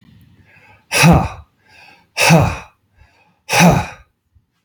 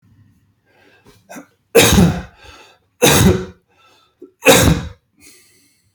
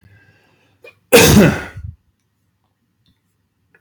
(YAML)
exhalation_length: 4.6 s
exhalation_amplitude: 32768
exhalation_signal_mean_std_ratio: 0.41
three_cough_length: 5.9 s
three_cough_amplitude: 32768
three_cough_signal_mean_std_ratio: 0.38
cough_length: 3.8 s
cough_amplitude: 32768
cough_signal_mean_std_ratio: 0.3
survey_phase: beta (2021-08-13 to 2022-03-07)
age: 45-64
gender: Male
wearing_mask: 'No'
symptom_none: true
smoker_status: Never smoked
respiratory_condition_asthma: false
respiratory_condition_other: false
recruitment_source: REACT
submission_delay: 0 days
covid_test_result: Negative
covid_test_method: RT-qPCR
influenza_a_test_result: Negative
influenza_b_test_result: Negative